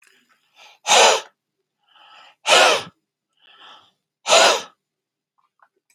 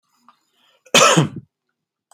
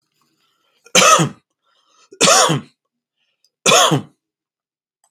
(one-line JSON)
{"exhalation_length": "5.9 s", "exhalation_amplitude": 29130, "exhalation_signal_mean_std_ratio": 0.33, "cough_length": "2.1 s", "cough_amplitude": 32635, "cough_signal_mean_std_ratio": 0.33, "three_cough_length": "5.1 s", "three_cough_amplitude": 32768, "three_cough_signal_mean_std_ratio": 0.38, "survey_phase": "beta (2021-08-13 to 2022-03-07)", "age": "45-64", "gender": "Male", "wearing_mask": "No", "symptom_none": true, "smoker_status": "Current smoker (e-cigarettes or vapes only)", "respiratory_condition_asthma": false, "respiratory_condition_other": false, "recruitment_source": "REACT", "submission_delay": "1 day", "covid_test_result": "Negative", "covid_test_method": "RT-qPCR"}